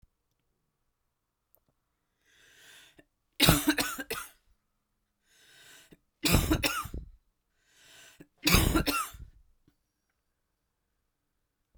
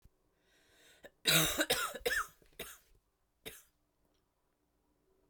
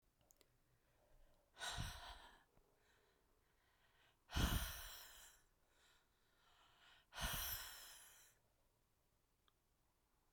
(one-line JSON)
{"three_cough_length": "11.8 s", "three_cough_amplitude": 20517, "three_cough_signal_mean_std_ratio": 0.3, "cough_length": "5.3 s", "cough_amplitude": 6934, "cough_signal_mean_std_ratio": 0.33, "exhalation_length": "10.3 s", "exhalation_amplitude": 1528, "exhalation_signal_mean_std_ratio": 0.35, "survey_phase": "beta (2021-08-13 to 2022-03-07)", "age": "45-64", "gender": "Female", "wearing_mask": "No", "symptom_cough_any": true, "symptom_new_continuous_cough": true, "symptom_shortness_of_breath": true, "symptom_sore_throat": true, "symptom_fatigue": true, "symptom_headache": true, "symptom_onset": "5 days", "smoker_status": "Never smoked", "respiratory_condition_asthma": false, "respiratory_condition_other": false, "recruitment_source": "Test and Trace", "submission_delay": "1 day", "covid_test_result": "Positive", "covid_test_method": "RT-qPCR", "covid_ct_value": 22.2, "covid_ct_gene": "ORF1ab gene", "covid_ct_mean": 23.4, "covid_viral_load": "21000 copies/ml", "covid_viral_load_category": "Low viral load (10K-1M copies/ml)"}